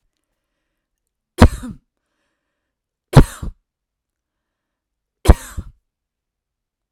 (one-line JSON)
{"three_cough_length": "6.9 s", "three_cough_amplitude": 32768, "three_cough_signal_mean_std_ratio": 0.17, "survey_phase": "alpha (2021-03-01 to 2021-08-12)", "age": "45-64", "gender": "Female", "wearing_mask": "No", "symptom_none": true, "smoker_status": "Never smoked", "respiratory_condition_asthma": false, "respiratory_condition_other": false, "recruitment_source": "REACT", "submission_delay": "2 days", "covid_test_result": "Negative", "covid_test_method": "RT-qPCR"}